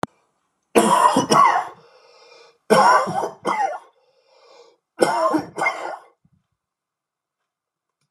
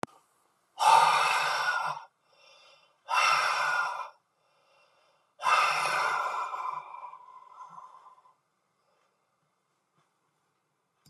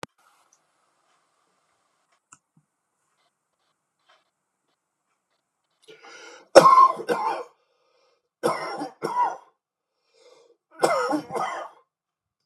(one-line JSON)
{"three_cough_length": "8.1 s", "three_cough_amplitude": 32767, "three_cough_signal_mean_std_ratio": 0.43, "exhalation_length": "11.1 s", "exhalation_amplitude": 14148, "exhalation_signal_mean_std_ratio": 0.46, "cough_length": "12.5 s", "cough_amplitude": 32768, "cough_signal_mean_std_ratio": 0.26, "survey_phase": "beta (2021-08-13 to 2022-03-07)", "age": "45-64", "gender": "Male", "wearing_mask": "No", "symptom_none": true, "smoker_status": "Never smoked", "respiratory_condition_asthma": false, "respiratory_condition_other": false, "recruitment_source": "REACT", "submission_delay": "6 days", "covid_test_result": "Negative", "covid_test_method": "RT-qPCR"}